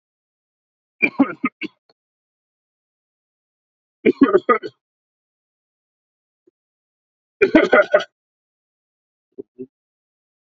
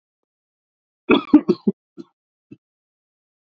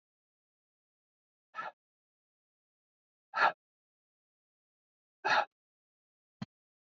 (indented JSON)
{
  "three_cough_length": "10.5 s",
  "three_cough_amplitude": 28542,
  "three_cough_signal_mean_std_ratio": 0.23,
  "cough_length": "3.4 s",
  "cough_amplitude": 28186,
  "cough_signal_mean_std_ratio": 0.22,
  "exhalation_length": "6.9 s",
  "exhalation_amplitude": 5692,
  "exhalation_signal_mean_std_ratio": 0.19,
  "survey_phase": "beta (2021-08-13 to 2022-03-07)",
  "age": "18-44",
  "gender": "Male",
  "wearing_mask": "No",
  "symptom_runny_or_blocked_nose": true,
  "symptom_headache": true,
  "smoker_status": "Never smoked",
  "respiratory_condition_asthma": false,
  "respiratory_condition_other": false,
  "recruitment_source": "Test and Trace",
  "submission_delay": "2 days",
  "covid_test_result": "Positive",
  "covid_test_method": "RT-qPCR",
  "covid_ct_value": 22.6,
  "covid_ct_gene": "ORF1ab gene",
  "covid_ct_mean": 23.6,
  "covid_viral_load": "19000 copies/ml",
  "covid_viral_load_category": "Low viral load (10K-1M copies/ml)"
}